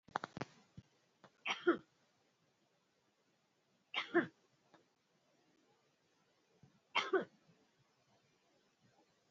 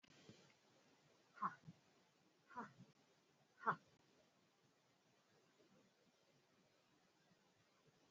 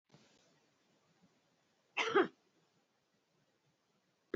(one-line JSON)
{"three_cough_length": "9.3 s", "three_cough_amplitude": 3894, "three_cough_signal_mean_std_ratio": 0.22, "exhalation_length": "8.1 s", "exhalation_amplitude": 1446, "exhalation_signal_mean_std_ratio": 0.23, "cough_length": "4.4 s", "cough_amplitude": 3472, "cough_signal_mean_std_ratio": 0.21, "survey_phase": "beta (2021-08-13 to 2022-03-07)", "age": "45-64", "gender": "Female", "wearing_mask": "No", "symptom_none": true, "smoker_status": "Never smoked", "respiratory_condition_asthma": false, "respiratory_condition_other": false, "recruitment_source": "REACT", "submission_delay": "1 day", "covid_test_result": "Negative", "covid_test_method": "RT-qPCR"}